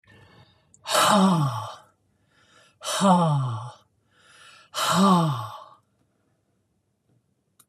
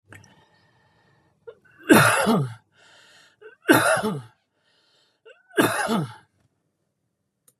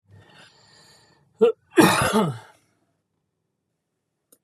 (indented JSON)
{
  "exhalation_length": "7.7 s",
  "exhalation_amplitude": 18106,
  "exhalation_signal_mean_std_ratio": 0.46,
  "three_cough_length": "7.6 s",
  "three_cough_amplitude": 28953,
  "three_cough_signal_mean_std_ratio": 0.35,
  "cough_length": "4.4 s",
  "cough_amplitude": 30090,
  "cough_signal_mean_std_ratio": 0.31,
  "survey_phase": "beta (2021-08-13 to 2022-03-07)",
  "age": "65+",
  "gender": "Male",
  "wearing_mask": "No",
  "symptom_none": true,
  "smoker_status": "Never smoked",
  "respiratory_condition_asthma": false,
  "respiratory_condition_other": false,
  "recruitment_source": "REACT",
  "submission_delay": "1 day",
  "covid_test_result": "Negative",
  "covid_test_method": "RT-qPCR",
  "influenza_a_test_result": "Negative",
  "influenza_b_test_result": "Negative"
}